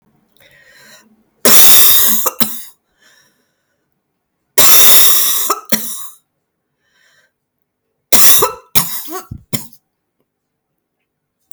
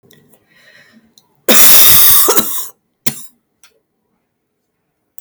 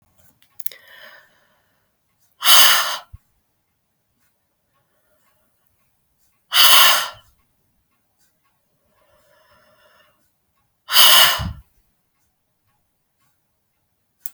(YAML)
three_cough_length: 11.5 s
three_cough_amplitude: 32768
three_cough_signal_mean_std_ratio: 0.41
cough_length: 5.2 s
cough_amplitude: 32768
cough_signal_mean_std_ratio: 0.41
exhalation_length: 14.3 s
exhalation_amplitude: 32768
exhalation_signal_mean_std_ratio: 0.26
survey_phase: beta (2021-08-13 to 2022-03-07)
age: 45-64
gender: Female
wearing_mask: 'No'
symptom_cough_any: true
symptom_runny_or_blocked_nose: true
symptom_diarrhoea: true
symptom_fatigue: true
symptom_fever_high_temperature: true
symptom_headache: true
symptom_loss_of_taste: true
symptom_other: true
smoker_status: Never smoked
respiratory_condition_asthma: false
respiratory_condition_other: false
recruitment_source: Test and Trace
submission_delay: 2 days
covid_test_result: Positive
covid_test_method: RT-qPCR
covid_ct_value: 28.4
covid_ct_gene: N gene